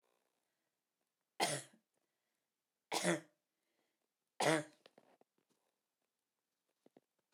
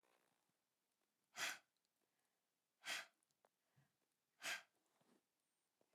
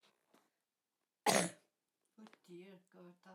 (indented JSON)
{
  "three_cough_length": "7.3 s",
  "three_cough_amplitude": 3502,
  "three_cough_signal_mean_std_ratio": 0.23,
  "exhalation_length": "5.9 s",
  "exhalation_amplitude": 683,
  "exhalation_signal_mean_std_ratio": 0.26,
  "cough_length": "3.3 s",
  "cough_amplitude": 4908,
  "cough_signal_mean_std_ratio": 0.24,
  "survey_phase": "alpha (2021-03-01 to 2021-08-12)",
  "age": "45-64",
  "gender": "Female",
  "wearing_mask": "Yes",
  "symptom_none": true,
  "smoker_status": "Never smoked",
  "respiratory_condition_asthma": false,
  "respiratory_condition_other": false,
  "recruitment_source": "REACT",
  "submission_delay": "2 days",
  "covid_test_result": "Negative",
  "covid_test_method": "RT-qPCR"
}